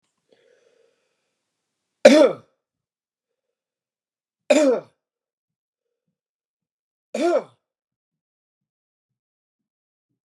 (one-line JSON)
{"three_cough_length": "10.2 s", "three_cough_amplitude": 32768, "three_cough_signal_mean_std_ratio": 0.21, "survey_phase": "beta (2021-08-13 to 2022-03-07)", "age": "45-64", "gender": "Male", "wearing_mask": "No", "symptom_none": true, "smoker_status": "Never smoked", "respiratory_condition_asthma": false, "respiratory_condition_other": false, "recruitment_source": "REACT", "submission_delay": "2 days", "covid_test_result": "Negative", "covid_test_method": "RT-qPCR", "influenza_a_test_result": "Negative", "influenza_b_test_result": "Negative"}